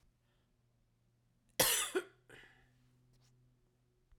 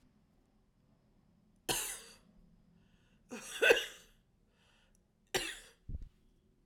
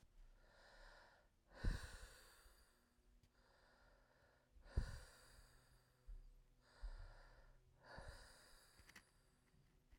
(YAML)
cough_length: 4.2 s
cough_amplitude: 6541
cough_signal_mean_std_ratio: 0.26
three_cough_length: 6.7 s
three_cough_amplitude: 9082
three_cough_signal_mean_std_ratio: 0.27
exhalation_length: 10.0 s
exhalation_amplitude: 1131
exhalation_signal_mean_std_ratio: 0.37
survey_phase: alpha (2021-03-01 to 2021-08-12)
age: 45-64
gender: Female
wearing_mask: 'No'
symptom_cough_any: true
symptom_shortness_of_breath: true
symptom_fatigue: true
symptom_fever_high_temperature: true
symptom_headache: true
symptom_change_to_sense_of_smell_or_taste: true
smoker_status: Never smoked
respiratory_condition_asthma: false
respiratory_condition_other: false
recruitment_source: Test and Trace
submission_delay: 2 days
covid_test_result: Positive
covid_test_method: RT-qPCR